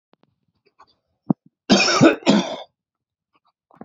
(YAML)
cough_length: 3.8 s
cough_amplitude: 30057
cough_signal_mean_std_ratio: 0.34
survey_phase: beta (2021-08-13 to 2022-03-07)
age: 18-44
gender: Male
wearing_mask: 'No'
symptom_runny_or_blocked_nose: true
symptom_fatigue: true
smoker_status: Ex-smoker
respiratory_condition_asthma: false
respiratory_condition_other: false
recruitment_source: REACT
submission_delay: 2 days
covid_test_result: Negative
covid_test_method: RT-qPCR